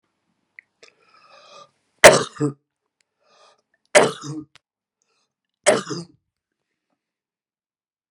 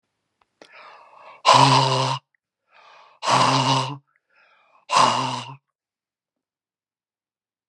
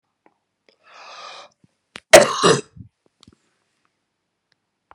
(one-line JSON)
{"three_cough_length": "8.1 s", "three_cough_amplitude": 32768, "three_cough_signal_mean_std_ratio": 0.2, "exhalation_length": "7.7 s", "exhalation_amplitude": 31160, "exhalation_signal_mean_std_ratio": 0.4, "cough_length": "4.9 s", "cough_amplitude": 32768, "cough_signal_mean_std_ratio": 0.2, "survey_phase": "beta (2021-08-13 to 2022-03-07)", "age": "65+", "gender": "Male", "wearing_mask": "No", "symptom_cough_any": true, "symptom_onset": "12 days", "smoker_status": "Never smoked", "respiratory_condition_asthma": false, "respiratory_condition_other": true, "recruitment_source": "REACT", "submission_delay": "1 day", "covid_test_result": "Negative", "covid_test_method": "RT-qPCR"}